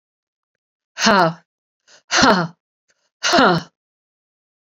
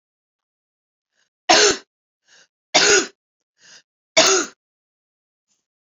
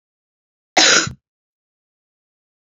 {"exhalation_length": "4.7 s", "exhalation_amplitude": 30678, "exhalation_signal_mean_std_ratio": 0.37, "three_cough_length": "5.9 s", "three_cough_amplitude": 32767, "three_cough_signal_mean_std_ratio": 0.3, "cough_length": "2.6 s", "cough_amplitude": 30558, "cough_signal_mean_std_ratio": 0.27, "survey_phase": "beta (2021-08-13 to 2022-03-07)", "age": "45-64", "gender": "Female", "wearing_mask": "No", "symptom_cough_any": true, "symptom_runny_or_blocked_nose": true, "symptom_headache": true, "symptom_onset": "3 days", "smoker_status": "Ex-smoker", "respiratory_condition_asthma": false, "respiratory_condition_other": false, "recruitment_source": "Test and Trace", "submission_delay": "2 days", "covid_test_result": "Positive", "covid_test_method": "RT-qPCR", "covid_ct_value": 19.9, "covid_ct_gene": "ORF1ab gene", "covid_ct_mean": 20.4, "covid_viral_load": "210000 copies/ml", "covid_viral_load_category": "Low viral load (10K-1M copies/ml)"}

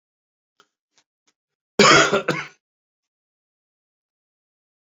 {"cough_length": "4.9 s", "cough_amplitude": 31327, "cough_signal_mean_std_ratio": 0.24, "survey_phase": "alpha (2021-03-01 to 2021-08-12)", "age": "45-64", "gender": "Male", "wearing_mask": "No", "symptom_new_continuous_cough": true, "symptom_fatigue": true, "symptom_headache": true, "smoker_status": "Never smoked", "respiratory_condition_asthma": false, "respiratory_condition_other": false, "recruitment_source": "Test and Trace", "submission_delay": "2 days", "covid_test_result": "Positive", "covid_test_method": "RT-qPCR", "covid_ct_value": 24.8, "covid_ct_gene": "ORF1ab gene", "covid_ct_mean": 25.0, "covid_viral_load": "6500 copies/ml", "covid_viral_load_category": "Minimal viral load (< 10K copies/ml)"}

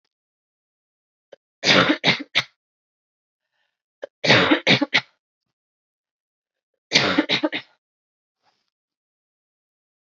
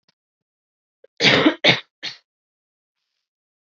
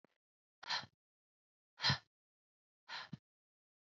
{"three_cough_length": "10.1 s", "three_cough_amplitude": 26945, "three_cough_signal_mean_std_ratio": 0.3, "cough_length": "3.7 s", "cough_amplitude": 29079, "cough_signal_mean_std_ratio": 0.28, "exhalation_length": "3.8 s", "exhalation_amplitude": 2723, "exhalation_signal_mean_std_ratio": 0.24, "survey_phase": "beta (2021-08-13 to 2022-03-07)", "age": "18-44", "gender": "Female", "wearing_mask": "No", "symptom_cough_any": true, "symptom_runny_or_blocked_nose": true, "symptom_fatigue": true, "symptom_headache": true, "symptom_change_to_sense_of_smell_or_taste": true, "symptom_loss_of_taste": true, "symptom_other": true, "symptom_onset": "3 days", "smoker_status": "Never smoked", "respiratory_condition_asthma": false, "respiratory_condition_other": false, "recruitment_source": "Test and Trace", "submission_delay": "2 days", "covid_test_result": "Positive", "covid_test_method": "RT-qPCR", "covid_ct_value": 21.6, "covid_ct_gene": "ORF1ab gene", "covid_ct_mean": 22.2, "covid_viral_load": "54000 copies/ml", "covid_viral_load_category": "Low viral load (10K-1M copies/ml)"}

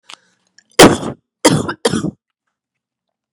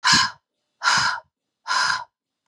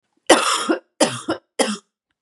{"cough_length": "3.3 s", "cough_amplitude": 32768, "cough_signal_mean_std_ratio": 0.31, "exhalation_length": "2.5 s", "exhalation_amplitude": 22747, "exhalation_signal_mean_std_ratio": 0.51, "three_cough_length": "2.2 s", "three_cough_amplitude": 32768, "three_cough_signal_mean_std_ratio": 0.45, "survey_phase": "beta (2021-08-13 to 2022-03-07)", "age": "18-44", "gender": "Female", "wearing_mask": "No", "symptom_cough_any": true, "symptom_new_continuous_cough": true, "symptom_runny_or_blocked_nose": true, "symptom_shortness_of_breath": true, "symptom_sore_throat": true, "symptom_fever_high_temperature": true, "symptom_onset": "4 days", "smoker_status": "Never smoked", "respiratory_condition_asthma": false, "respiratory_condition_other": false, "recruitment_source": "Test and Trace", "submission_delay": "2 days", "covid_test_result": "Positive", "covid_test_method": "RT-qPCR", "covid_ct_value": 25.3, "covid_ct_gene": "N gene"}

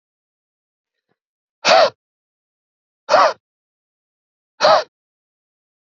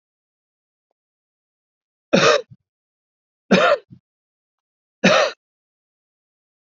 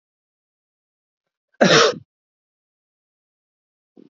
{"exhalation_length": "5.9 s", "exhalation_amplitude": 28919, "exhalation_signal_mean_std_ratio": 0.27, "three_cough_length": "6.7 s", "three_cough_amplitude": 27640, "three_cough_signal_mean_std_ratio": 0.28, "cough_length": "4.1 s", "cough_amplitude": 29066, "cough_signal_mean_std_ratio": 0.22, "survey_phase": "beta (2021-08-13 to 2022-03-07)", "age": "18-44", "gender": "Male", "wearing_mask": "No", "symptom_runny_or_blocked_nose": true, "symptom_fatigue": true, "symptom_headache": true, "smoker_status": "Never smoked", "respiratory_condition_asthma": false, "respiratory_condition_other": false, "recruitment_source": "Test and Trace", "submission_delay": "1 day", "covid_test_result": "Positive", "covid_test_method": "RT-qPCR", "covid_ct_value": 30.7, "covid_ct_gene": "ORF1ab gene"}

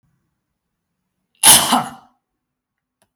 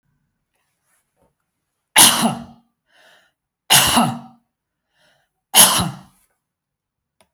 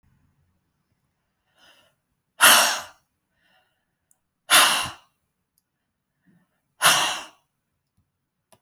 {"cough_length": "3.2 s", "cough_amplitude": 32768, "cough_signal_mean_std_ratio": 0.26, "three_cough_length": "7.3 s", "three_cough_amplitude": 32768, "three_cough_signal_mean_std_ratio": 0.3, "exhalation_length": "8.6 s", "exhalation_amplitude": 32768, "exhalation_signal_mean_std_ratio": 0.27, "survey_phase": "beta (2021-08-13 to 2022-03-07)", "age": "65+", "gender": "Male", "wearing_mask": "No", "symptom_none": true, "smoker_status": "Never smoked", "respiratory_condition_asthma": false, "respiratory_condition_other": false, "recruitment_source": "REACT", "submission_delay": "2 days", "covid_test_result": "Negative", "covid_test_method": "RT-qPCR"}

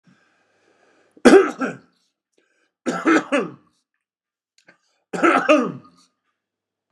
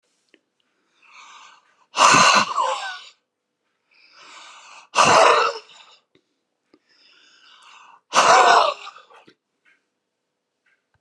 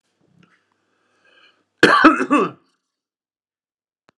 {"three_cough_length": "6.9 s", "three_cough_amplitude": 32768, "three_cough_signal_mean_std_ratio": 0.32, "exhalation_length": "11.0 s", "exhalation_amplitude": 31657, "exhalation_signal_mean_std_ratio": 0.35, "cough_length": "4.2 s", "cough_amplitude": 32768, "cough_signal_mean_std_ratio": 0.28, "survey_phase": "beta (2021-08-13 to 2022-03-07)", "age": "65+", "gender": "Male", "wearing_mask": "No", "symptom_none": true, "smoker_status": "Ex-smoker", "respiratory_condition_asthma": false, "respiratory_condition_other": false, "recruitment_source": "REACT", "submission_delay": "3 days", "covid_test_result": "Negative", "covid_test_method": "RT-qPCR", "influenza_a_test_result": "Negative", "influenza_b_test_result": "Negative"}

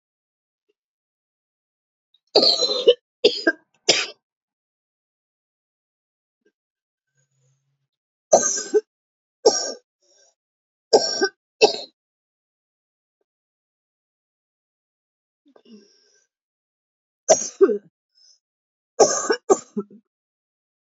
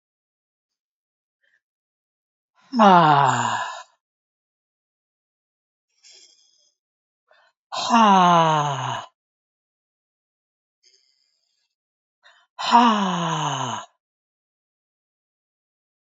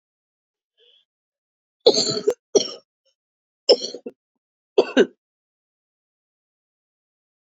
{"three_cough_length": "20.9 s", "three_cough_amplitude": 29956, "three_cough_signal_mean_std_ratio": 0.25, "exhalation_length": "16.1 s", "exhalation_amplitude": 28391, "exhalation_signal_mean_std_ratio": 0.33, "cough_length": "7.5 s", "cough_amplitude": 28950, "cough_signal_mean_std_ratio": 0.23, "survey_phase": "beta (2021-08-13 to 2022-03-07)", "age": "45-64", "gender": "Female", "wearing_mask": "No", "symptom_cough_any": true, "symptom_new_continuous_cough": true, "symptom_runny_or_blocked_nose": true, "symptom_shortness_of_breath": true, "symptom_abdominal_pain": true, "symptom_fatigue": true, "symptom_headache": true, "symptom_change_to_sense_of_smell_or_taste": true, "symptom_other": true, "smoker_status": "Never smoked", "respiratory_condition_asthma": false, "respiratory_condition_other": false, "recruitment_source": "Test and Trace", "submission_delay": "1 day", "covid_test_result": "Positive", "covid_test_method": "LFT"}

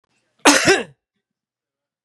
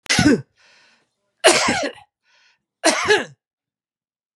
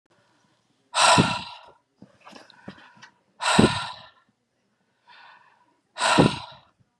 {"cough_length": "2.0 s", "cough_amplitude": 32767, "cough_signal_mean_std_ratio": 0.32, "three_cough_length": "4.4 s", "three_cough_amplitude": 32767, "three_cough_signal_mean_std_ratio": 0.4, "exhalation_length": "7.0 s", "exhalation_amplitude": 30033, "exhalation_signal_mean_std_ratio": 0.33, "survey_phase": "beta (2021-08-13 to 2022-03-07)", "age": "65+", "gender": "Male", "wearing_mask": "No", "symptom_cough_any": true, "symptom_new_continuous_cough": true, "symptom_runny_or_blocked_nose": true, "symptom_sore_throat": true, "symptom_change_to_sense_of_smell_or_taste": true, "symptom_loss_of_taste": true, "symptom_onset": "4 days", "smoker_status": "Ex-smoker", "respiratory_condition_asthma": false, "respiratory_condition_other": false, "recruitment_source": "Test and Trace", "submission_delay": "3 days", "covid_test_result": "Positive", "covid_test_method": "RT-qPCR"}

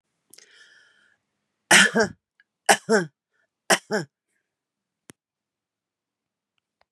{"three_cough_length": "6.9 s", "three_cough_amplitude": 29300, "three_cough_signal_mean_std_ratio": 0.24, "survey_phase": "beta (2021-08-13 to 2022-03-07)", "age": "45-64", "gender": "Female", "wearing_mask": "No", "symptom_runny_or_blocked_nose": true, "smoker_status": "Ex-smoker", "respiratory_condition_asthma": false, "respiratory_condition_other": false, "recruitment_source": "REACT", "submission_delay": "1 day", "covid_test_result": "Negative", "covid_test_method": "RT-qPCR"}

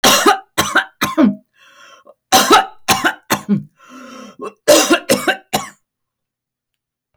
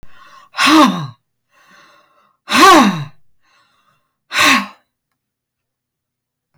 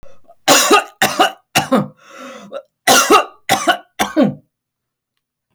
{"three_cough_length": "7.2 s", "three_cough_amplitude": 32768, "three_cough_signal_mean_std_ratio": 0.46, "exhalation_length": "6.6 s", "exhalation_amplitude": 32768, "exhalation_signal_mean_std_ratio": 0.37, "cough_length": "5.5 s", "cough_amplitude": 32768, "cough_signal_mean_std_ratio": 0.47, "survey_phase": "alpha (2021-03-01 to 2021-08-12)", "age": "65+", "gender": "Female", "wearing_mask": "No", "symptom_none": true, "smoker_status": "Never smoked", "respiratory_condition_asthma": false, "respiratory_condition_other": false, "recruitment_source": "REACT", "submission_delay": "1 day", "covid_test_result": "Negative", "covid_test_method": "RT-qPCR"}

